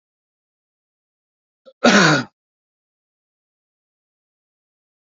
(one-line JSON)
{"cough_length": "5.0 s", "cough_amplitude": 28668, "cough_signal_mean_std_ratio": 0.22, "survey_phase": "beta (2021-08-13 to 2022-03-07)", "age": "45-64", "gender": "Male", "wearing_mask": "No", "symptom_cough_any": true, "symptom_runny_or_blocked_nose": true, "symptom_headache": true, "smoker_status": "Ex-smoker", "respiratory_condition_asthma": false, "respiratory_condition_other": false, "recruitment_source": "Test and Trace", "submission_delay": "2 days", "covid_test_result": "Positive", "covid_test_method": "RT-qPCR", "covid_ct_value": 19.7, "covid_ct_gene": "ORF1ab gene", "covid_ct_mean": 20.8, "covid_viral_load": "150000 copies/ml", "covid_viral_load_category": "Low viral load (10K-1M copies/ml)"}